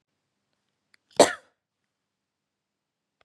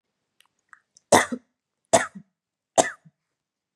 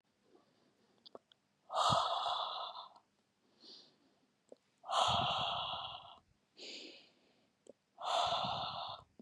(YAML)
cough_length: 3.2 s
cough_amplitude: 26353
cough_signal_mean_std_ratio: 0.12
three_cough_length: 3.8 s
three_cough_amplitude: 31671
three_cough_signal_mean_std_ratio: 0.22
exhalation_length: 9.2 s
exhalation_amplitude: 4546
exhalation_signal_mean_std_ratio: 0.49
survey_phase: beta (2021-08-13 to 2022-03-07)
age: 18-44
gender: Female
wearing_mask: 'No'
symptom_none: true
smoker_status: Never smoked
respiratory_condition_asthma: false
respiratory_condition_other: false
recruitment_source: REACT
submission_delay: 1 day
covid_test_result: Negative
covid_test_method: RT-qPCR
influenza_a_test_result: Negative
influenza_b_test_result: Negative